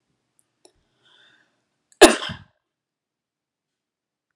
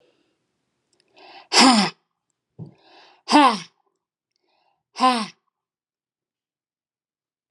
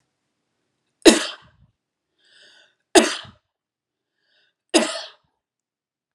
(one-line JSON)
{"cough_length": "4.4 s", "cough_amplitude": 32768, "cough_signal_mean_std_ratio": 0.14, "exhalation_length": "7.5 s", "exhalation_amplitude": 30114, "exhalation_signal_mean_std_ratio": 0.26, "three_cough_length": "6.1 s", "three_cough_amplitude": 32768, "three_cough_signal_mean_std_ratio": 0.21, "survey_phase": "beta (2021-08-13 to 2022-03-07)", "age": "18-44", "gender": "Female", "wearing_mask": "No", "symptom_sore_throat": true, "symptom_onset": "12 days", "smoker_status": "Never smoked", "respiratory_condition_asthma": false, "respiratory_condition_other": false, "recruitment_source": "REACT", "submission_delay": "1 day", "covid_test_result": "Negative", "covid_test_method": "RT-qPCR"}